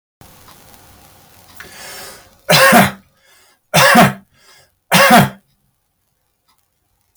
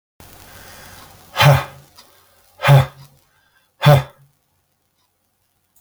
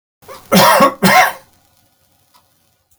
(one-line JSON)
{"three_cough_length": "7.2 s", "three_cough_amplitude": 32768, "three_cough_signal_mean_std_ratio": 0.36, "exhalation_length": "5.8 s", "exhalation_amplitude": 31280, "exhalation_signal_mean_std_ratio": 0.29, "cough_length": "3.0 s", "cough_amplitude": 32768, "cough_signal_mean_std_ratio": 0.43, "survey_phase": "beta (2021-08-13 to 2022-03-07)", "age": "65+", "gender": "Male", "wearing_mask": "No", "symptom_none": true, "smoker_status": "Never smoked", "respiratory_condition_asthma": false, "respiratory_condition_other": false, "recruitment_source": "REACT", "submission_delay": "14 days", "covid_test_result": "Negative", "covid_test_method": "RT-qPCR"}